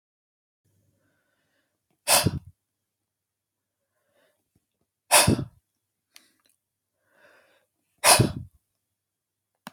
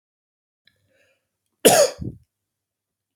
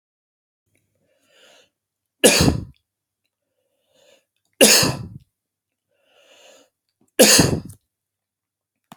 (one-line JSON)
{"exhalation_length": "9.7 s", "exhalation_amplitude": 24263, "exhalation_signal_mean_std_ratio": 0.22, "cough_length": "3.2 s", "cough_amplitude": 31029, "cough_signal_mean_std_ratio": 0.24, "three_cough_length": "9.0 s", "three_cough_amplitude": 32768, "three_cough_signal_mean_std_ratio": 0.27, "survey_phase": "alpha (2021-03-01 to 2021-08-12)", "age": "18-44", "gender": "Male", "wearing_mask": "No", "symptom_none": true, "symptom_onset": "6 days", "smoker_status": "Never smoked", "respiratory_condition_asthma": false, "respiratory_condition_other": false, "recruitment_source": "REACT", "submission_delay": "1 day", "covid_test_result": "Negative", "covid_test_method": "RT-qPCR"}